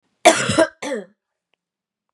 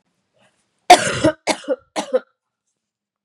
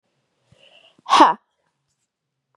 cough_length: 2.1 s
cough_amplitude: 32768
cough_signal_mean_std_ratio: 0.34
three_cough_length: 3.2 s
three_cough_amplitude: 32768
three_cough_signal_mean_std_ratio: 0.29
exhalation_length: 2.6 s
exhalation_amplitude: 32480
exhalation_signal_mean_std_ratio: 0.24
survey_phase: beta (2021-08-13 to 2022-03-07)
age: 45-64
gender: Female
wearing_mask: 'No'
symptom_cough_any: true
symptom_runny_or_blocked_nose: true
symptom_sore_throat: true
symptom_fatigue: true
symptom_fever_high_temperature: true
symptom_headache: true
symptom_onset: 4 days
smoker_status: Never smoked
respiratory_condition_asthma: false
respiratory_condition_other: false
recruitment_source: Test and Trace
submission_delay: 1 day
covid_test_result: Positive
covid_test_method: RT-qPCR
covid_ct_value: 15.1
covid_ct_gene: ORF1ab gene
covid_ct_mean: 15.4
covid_viral_load: 9000000 copies/ml
covid_viral_load_category: High viral load (>1M copies/ml)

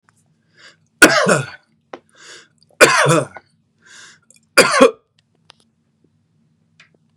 three_cough_length: 7.2 s
three_cough_amplitude: 32768
three_cough_signal_mean_std_ratio: 0.31
survey_phase: beta (2021-08-13 to 2022-03-07)
age: 18-44
gender: Male
wearing_mask: 'No'
symptom_none: true
smoker_status: Ex-smoker
respiratory_condition_asthma: false
respiratory_condition_other: false
recruitment_source: REACT
submission_delay: 3 days
covid_test_result: Negative
covid_test_method: RT-qPCR
influenza_a_test_result: Negative
influenza_b_test_result: Negative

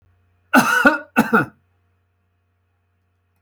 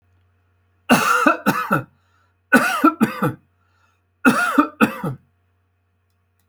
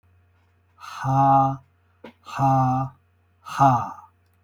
cough_length: 3.4 s
cough_amplitude: 28166
cough_signal_mean_std_ratio: 0.35
three_cough_length: 6.5 s
three_cough_amplitude: 28651
three_cough_signal_mean_std_ratio: 0.43
exhalation_length: 4.4 s
exhalation_amplitude: 18172
exhalation_signal_mean_std_ratio: 0.51
survey_phase: beta (2021-08-13 to 2022-03-07)
age: 65+
gender: Male
wearing_mask: 'No'
symptom_none: true
smoker_status: Never smoked
respiratory_condition_asthma: false
respiratory_condition_other: false
recruitment_source: REACT
submission_delay: 1 day
covid_test_result: Negative
covid_test_method: RT-qPCR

